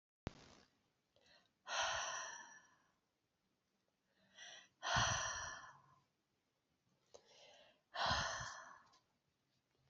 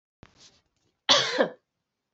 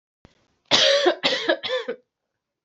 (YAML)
exhalation_length: 9.9 s
exhalation_amplitude: 2007
exhalation_signal_mean_std_ratio: 0.39
cough_length: 2.1 s
cough_amplitude: 16630
cough_signal_mean_std_ratio: 0.31
three_cough_length: 2.6 s
three_cough_amplitude: 26134
three_cough_signal_mean_std_ratio: 0.5
survey_phase: alpha (2021-03-01 to 2021-08-12)
age: 18-44
gender: Female
wearing_mask: 'No'
symptom_cough_any: true
symptom_headache: true
symptom_onset: 3 days
smoker_status: Never smoked
respiratory_condition_asthma: false
respiratory_condition_other: false
recruitment_source: Test and Trace
submission_delay: 2 days
covid_test_result: Positive
covid_test_method: RT-qPCR